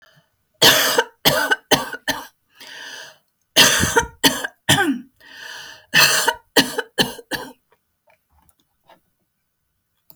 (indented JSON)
{
  "three_cough_length": "10.2 s",
  "three_cough_amplitude": 32768,
  "three_cough_signal_mean_std_ratio": 0.41,
  "survey_phase": "beta (2021-08-13 to 2022-03-07)",
  "age": "65+",
  "gender": "Female",
  "wearing_mask": "No",
  "symptom_cough_any": true,
  "smoker_status": "Never smoked",
  "respiratory_condition_asthma": false,
  "respiratory_condition_other": true,
  "recruitment_source": "REACT",
  "submission_delay": "2 days",
  "covid_test_result": "Negative",
  "covid_test_method": "RT-qPCR"
}